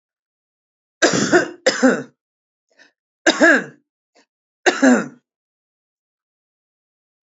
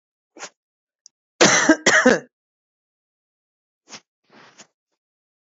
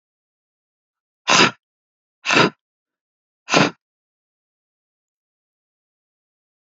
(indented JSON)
{
  "three_cough_length": "7.3 s",
  "three_cough_amplitude": 30877,
  "three_cough_signal_mean_std_ratio": 0.33,
  "cough_length": "5.5 s",
  "cough_amplitude": 30009,
  "cough_signal_mean_std_ratio": 0.27,
  "exhalation_length": "6.7 s",
  "exhalation_amplitude": 32768,
  "exhalation_signal_mean_std_ratio": 0.23,
  "survey_phase": "alpha (2021-03-01 to 2021-08-12)",
  "age": "18-44",
  "gender": "Female",
  "wearing_mask": "No",
  "symptom_none": true,
  "smoker_status": "Ex-smoker",
  "respiratory_condition_asthma": false,
  "respiratory_condition_other": false,
  "recruitment_source": "REACT",
  "submission_delay": "2 days",
  "covid_test_result": "Negative",
  "covid_test_method": "RT-qPCR"
}